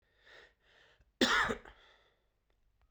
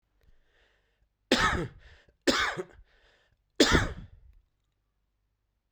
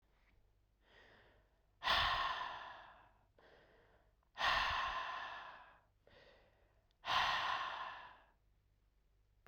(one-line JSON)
{"cough_length": "2.9 s", "cough_amplitude": 6159, "cough_signal_mean_std_ratio": 0.29, "three_cough_length": "5.7 s", "three_cough_amplitude": 12511, "three_cough_signal_mean_std_ratio": 0.32, "exhalation_length": "9.5 s", "exhalation_amplitude": 2482, "exhalation_signal_mean_std_ratio": 0.46, "survey_phase": "beta (2021-08-13 to 2022-03-07)", "age": "18-44", "gender": "Male", "wearing_mask": "No", "symptom_runny_or_blocked_nose": true, "symptom_fatigue": true, "symptom_fever_high_temperature": true, "symptom_loss_of_taste": true, "symptom_onset": "3 days", "smoker_status": "Ex-smoker", "respiratory_condition_asthma": false, "respiratory_condition_other": false, "recruitment_source": "Test and Trace", "submission_delay": "2 days", "covid_test_result": "Positive", "covid_test_method": "RT-qPCR"}